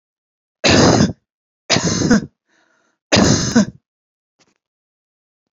{
  "three_cough_length": "5.5 s",
  "three_cough_amplitude": 30731,
  "three_cough_signal_mean_std_ratio": 0.42,
  "survey_phase": "beta (2021-08-13 to 2022-03-07)",
  "age": "45-64",
  "gender": "Female",
  "wearing_mask": "No",
  "symptom_none": true,
  "smoker_status": "Never smoked",
  "respiratory_condition_asthma": true,
  "respiratory_condition_other": false,
  "recruitment_source": "REACT",
  "submission_delay": "1 day",
  "covid_test_result": "Negative",
  "covid_test_method": "RT-qPCR"
}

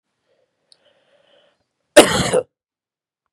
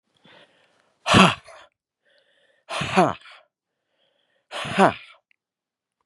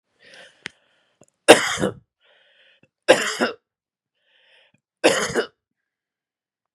{
  "cough_length": "3.3 s",
  "cough_amplitude": 32768,
  "cough_signal_mean_std_ratio": 0.23,
  "exhalation_length": "6.1 s",
  "exhalation_amplitude": 32496,
  "exhalation_signal_mean_std_ratio": 0.27,
  "three_cough_length": "6.7 s",
  "three_cough_amplitude": 32768,
  "three_cough_signal_mean_std_ratio": 0.25,
  "survey_phase": "beta (2021-08-13 to 2022-03-07)",
  "age": "45-64",
  "gender": "Male",
  "wearing_mask": "No",
  "symptom_none": true,
  "smoker_status": "Never smoked",
  "respiratory_condition_asthma": false,
  "respiratory_condition_other": false,
  "recruitment_source": "REACT",
  "submission_delay": "2 days",
  "covid_test_result": "Negative",
  "covid_test_method": "RT-qPCR",
  "influenza_a_test_result": "Negative",
  "influenza_b_test_result": "Negative"
}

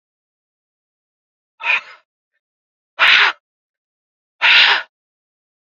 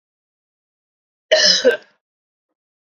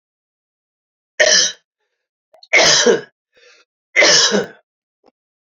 {
  "exhalation_length": "5.7 s",
  "exhalation_amplitude": 31872,
  "exhalation_signal_mean_std_ratio": 0.31,
  "cough_length": "3.0 s",
  "cough_amplitude": 31691,
  "cough_signal_mean_std_ratio": 0.3,
  "three_cough_length": "5.5 s",
  "three_cough_amplitude": 32688,
  "three_cough_signal_mean_std_ratio": 0.4,
  "survey_phase": "beta (2021-08-13 to 2022-03-07)",
  "age": "18-44",
  "gender": "Male",
  "wearing_mask": "No",
  "symptom_none": true,
  "smoker_status": "Never smoked",
  "respiratory_condition_asthma": false,
  "respiratory_condition_other": false,
  "recruitment_source": "REACT",
  "submission_delay": "0 days",
  "covid_test_result": "Negative",
  "covid_test_method": "RT-qPCR"
}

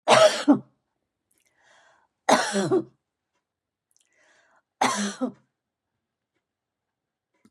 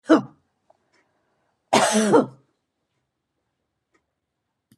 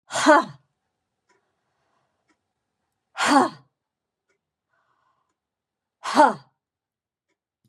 {
  "three_cough_length": "7.5 s",
  "three_cough_amplitude": 24080,
  "three_cough_signal_mean_std_ratio": 0.31,
  "cough_length": "4.8 s",
  "cough_amplitude": 21439,
  "cough_signal_mean_std_ratio": 0.29,
  "exhalation_length": "7.7 s",
  "exhalation_amplitude": 24403,
  "exhalation_signal_mean_std_ratio": 0.25,
  "survey_phase": "beta (2021-08-13 to 2022-03-07)",
  "age": "65+",
  "gender": "Female",
  "wearing_mask": "No",
  "symptom_none": true,
  "smoker_status": "Never smoked",
  "respiratory_condition_asthma": false,
  "respiratory_condition_other": false,
  "recruitment_source": "REACT",
  "submission_delay": "1 day",
  "covid_test_result": "Negative",
  "covid_test_method": "RT-qPCR",
  "influenza_a_test_result": "Negative",
  "influenza_b_test_result": "Negative"
}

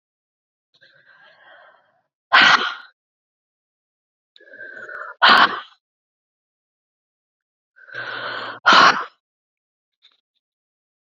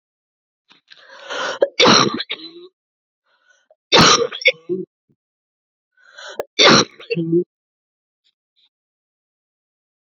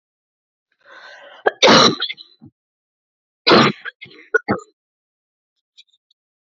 {
  "exhalation_length": "11.0 s",
  "exhalation_amplitude": 32767,
  "exhalation_signal_mean_std_ratio": 0.27,
  "three_cough_length": "10.2 s",
  "three_cough_amplitude": 32768,
  "three_cough_signal_mean_std_ratio": 0.33,
  "cough_length": "6.5 s",
  "cough_amplitude": 31596,
  "cough_signal_mean_std_ratio": 0.29,
  "survey_phase": "beta (2021-08-13 to 2022-03-07)",
  "age": "18-44",
  "gender": "Female",
  "wearing_mask": "No",
  "symptom_new_continuous_cough": true,
  "symptom_runny_or_blocked_nose": true,
  "symptom_sore_throat": true,
  "symptom_fatigue": true,
  "symptom_fever_high_temperature": true,
  "symptom_headache": true,
  "symptom_onset": "3 days",
  "smoker_status": "Ex-smoker",
  "respiratory_condition_asthma": false,
  "respiratory_condition_other": false,
  "recruitment_source": "Test and Trace",
  "submission_delay": "2 days",
  "covid_test_result": "Positive",
  "covid_test_method": "LAMP"
}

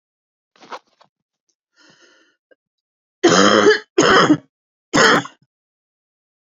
{
  "cough_length": "6.6 s",
  "cough_amplitude": 30685,
  "cough_signal_mean_std_ratio": 0.36,
  "survey_phase": "beta (2021-08-13 to 2022-03-07)",
  "age": "45-64",
  "gender": "Female",
  "wearing_mask": "No",
  "symptom_cough_any": true,
  "symptom_runny_or_blocked_nose": true,
  "symptom_shortness_of_breath": true,
  "symptom_sore_throat": true,
  "symptom_fatigue": true,
  "symptom_headache": true,
  "symptom_change_to_sense_of_smell_or_taste": true,
  "symptom_onset": "7 days",
  "smoker_status": "Never smoked",
  "respiratory_condition_asthma": true,
  "respiratory_condition_other": true,
  "recruitment_source": "Test and Trace",
  "submission_delay": "2 days",
  "covid_test_result": "Positive",
  "covid_test_method": "ePCR"
}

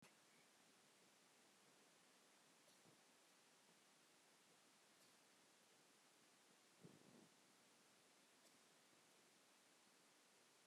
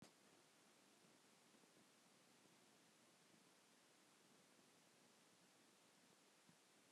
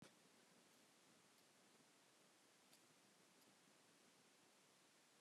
{
  "three_cough_length": "10.7 s",
  "three_cough_amplitude": 81,
  "three_cough_signal_mean_std_ratio": 1.11,
  "exhalation_length": "6.9 s",
  "exhalation_amplitude": 77,
  "exhalation_signal_mean_std_ratio": 1.13,
  "cough_length": "5.2 s",
  "cough_amplitude": 86,
  "cough_signal_mean_std_ratio": 1.11,
  "survey_phase": "beta (2021-08-13 to 2022-03-07)",
  "age": "65+",
  "gender": "Female",
  "wearing_mask": "No",
  "symptom_cough_any": true,
  "symptom_new_continuous_cough": true,
  "symptom_runny_or_blocked_nose": true,
  "symptom_shortness_of_breath": true,
  "symptom_diarrhoea": true,
  "symptom_fatigue": true,
  "symptom_headache": true,
  "symptom_change_to_sense_of_smell_or_taste": true,
  "symptom_onset": "5 days",
  "smoker_status": "Never smoked",
  "respiratory_condition_asthma": false,
  "respiratory_condition_other": false,
  "recruitment_source": "Test and Trace",
  "submission_delay": "2 days",
  "covid_test_result": "Positive",
  "covid_test_method": "RT-qPCR",
  "covid_ct_value": 21.4,
  "covid_ct_gene": "ORF1ab gene"
}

